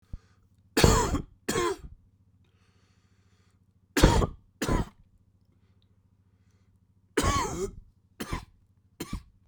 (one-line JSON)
{"three_cough_length": "9.5 s", "three_cough_amplitude": 23776, "three_cough_signal_mean_std_ratio": 0.35, "survey_phase": "beta (2021-08-13 to 2022-03-07)", "age": "45-64", "gender": "Male", "wearing_mask": "No", "symptom_cough_any": true, "symptom_runny_or_blocked_nose": true, "symptom_shortness_of_breath": true, "symptom_sore_throat": true, "symptom_fatigue": true, "symptom_fever_high_temperature": true, "symptom_headache": true, "symptom_change_to_sense_of_smell_or_taste": true, "symptom_other": true, "smoker_status": "Never smoked", "respiratory_condition_asthma": true, "respiratory_condition_other": false, "recruitment_source": "Test and Trace", "submission_delay": "1 day", "covid_test_result": "Positive", "covid_test_method": "RT-qPCR"}